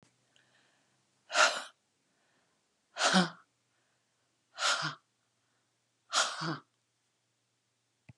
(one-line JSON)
{"exhalation_length": "8.2 s", "exhalation_amplitude": 8568, "exhalation_signal_mean_std_ratio": 0.3, "survey_phase": "beta (2021-08-13 to 2022-03-07)", "age": "45-64", "gender": "Female", "wearing_mask": "No", "symptom_none": true, "smoker_status": "Never smoked", "respiratory_condition_asthma": false, "respiratory_condition_other": false, "recruitment_source": "REACT", "submission_delay": "1 day", "covid_test_result": "Negative", "covid_test_method": "RT-qPCR"}